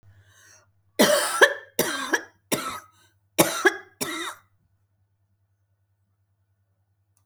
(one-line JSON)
{"cough_length": "7.3 s", "cough_amplitude": 27218, "cough_signal_mean_std_ratio": 0.33, "survey_phase": "alpha (2021-03-01 to 2021-08-12)", "age": "65+", "gender": "Female", "wearing_mask": "No", "symptom_none": true, "smoker_status": "Never smoked", "respiratory_condition_asthma": false, "respiratory_condition_other": false, "recruitment_source": "REACT", "submission_delay": "2 days", "covid_test_result": "Negative", "covid_test_method": "RT-qPCR"}